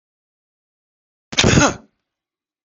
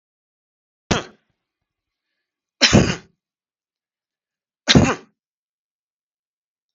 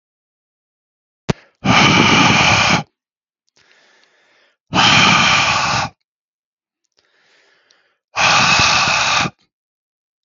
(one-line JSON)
{"cough_length": "2.6 s", "cough_amplitude": 32768, "cough_signal_mean_std_ratio": 0.28, "three_cough_length": "6.7 s", "three_cough_amplitude": 32768, "three_cough_signal_mean_std_ratio": 0.23, "exhalation_length": "10.2 s", "exhalation_amplitude": 32768, "exhalation_signal_mean_std_ratio": 0.51, "survey_phase": "beta (2021-08-13 to 2022-03-07)", "age": "45-64", "gender": "Male", "wearing_mask": "No", "symptom_none": true, "smoker_status": "Never smoked", "respiratory_condition_asthma": false, "respiratory_condition_other": false, "recruitment_source": "REACT", "submission_delay": "2 days", "covid_test_result": "Negative", "covid_test_method": "RT-qPCR", "influenza_a_test_result": "Negative", "influenza_b_test_result": "Negative"}